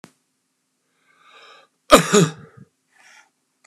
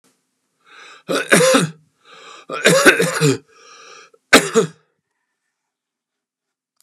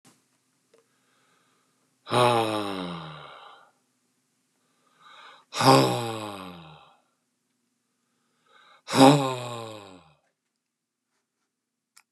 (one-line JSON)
{"cough_length": "3.7 s", "cough_amplitude": 32768, "cough_signal_mean_std_ratio": 0.22, "three_cough_length": "6.8 s", "three_cough_amplitude": 32768, "three_cough_signal_mean_std_ratio": 0.37, "exhalation_length": "12.1 s", "exhalation_amplitude": 28558, "exhalation_signal_mean_std_ratio": 0.29, "survey_phase": "beta (2021-08-13 to 2022-03-07)", "age": "65+", "gender": "Male", "wearing_mask": "No", "symptom_none": true, "smoker_status": "Never smoked", "respiratory_condition_asthma": false, "respiratory_condition_other": false, "recruitment_source": "REACT", "submission_delay": "2 days", "covid_test_result": "Negative", "covid_test_method": "RT-qPCR", "influenza_a_test_result": "Negative", "influenza_b_test_result": "Negative"}